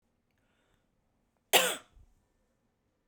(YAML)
cough_length: 3.1 s
cough_amplitude: 14185
cough_signal_mean_std_ratio: 0.2
survey_phase: beta (2021-08-13 to 2022-03-07)
age: 45-64
gender: Female
wearing_mask: 'Yes'
symptom_none: true
smoker_status: Current smoker (1 to 10 cigarettes per day)
respiratory_condition_asthma: false
respiratory_condition_other: false
recruitment_source: REACT
submission_delay: 3 days
covid_test_result: Negative
covid_test_method: RT-qPCR